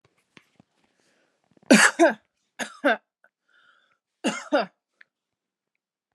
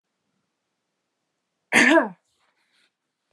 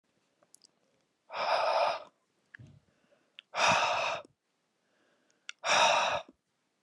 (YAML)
three_cough_length: 6.1 s
three_cough_amplitude: 28473
three_cough_signal_mean_std_ratio: 0.26
cough_length: 3.3 s
cough_amplitude: 23200
cough_signal_mean_std_ratio: 0.25
exhalation_length: 6.8 s
exhalation_amplitude: 7514
exhalation_signal_mean_std_ratio: 0.44
survey_phase: beta (2021-08-13 to 2022-03-07)
age: 18-44
gender: Female
wearing_mask: 'No'
symptom_none: true
smoker_status: Never smoked
respiratory_condition_asthma: false
respiratory_condition_other: false
recruitment_source: REACT
submission_delay: 1 day
covid_test_result: Negative
covid_test_method: RT-qPCR